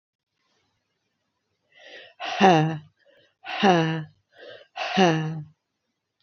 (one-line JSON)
{"exhalation_length": "6.2 s", "exhalation_amplitude": 23109, "exhalation_signal_mean_std_ratio": 0.37, "survey_phase": "beta (2021-08-13 to 2022-03-07)", "age": "45-64", "gender": "Female", "wearing_mask": "No", "symptom_cough_any": true, "symptom_runny_or_blocked_nose": true, "symptom_shortness_of_breath": true, "symptom_fatigue": true, "symptom_headache": true, "symptom_onset": "3 days", "smoker_status": "Never smoked", "respiratory_condition_asthma": false, "respiratory_condition_other": false, "recruitment_source": "Test and Trace", "submission_delay": "1 day", "covid_test_result": "Positive", "covid_test_method": "RT-qPCR", "covid_ct_value": 30.2, "covid_ct_gene": "ORF1ab gene"}